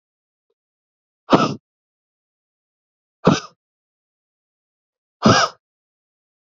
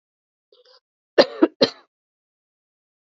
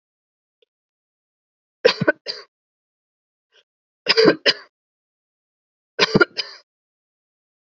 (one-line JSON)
{"exhalation_length": "6.6 s", "exhalation_amplitude": 28156, "exhalation_signal_mean_std_ratio": 0.22, "cough_length": "3.2 s", "cough_amplitude": 27884, "cough_signal_mean_std_ratio": 0.19, "three_cough_length": "7.8 s", "three_cough_amplitude": 31051, "three_cough_signal_mean_std_ratio": 0.23, "survey_phase": "beta (2021-08-13 to 2022-03-07)", "age": "18-44", "gender": "Female", "wearing_mask": "No", "symptom_runny_or_blocked_nose": true, "symptom_other": true, "symptom_onset": "5 days", "smoker_status": "Never smoked", "respiratory_condition_asthma": false, "respiratory_condition_other": false, "recruitment_source": "REACT", "submission_delay": "2 days", "covid_test_result": "Negative", "covid_test_method": "RT-qPCR", "influenza_a_test_result": "Negative", "influenza_b_test_result": "Negative"}